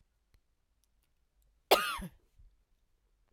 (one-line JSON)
{"cough_length": "3.3 s", "cough_amplitude": 12585, "cough_signal_mean_std_ratio": 0.2, "survey_phase": "alpha (2021-03-01 to 2021-08-12)", "age": "45-64", "gender": "Female", "wearing_mask": "No", "symptom_none": true, "smoker_status": "Ex-smoker", "respiratory_condition_asthma": false, "respiratory_condition_other": false, "recruitment_source": "REACT", "submission_delay": "1 day", "covid_test_result": "Negative", "covid_test_method": "RT-qPCR"}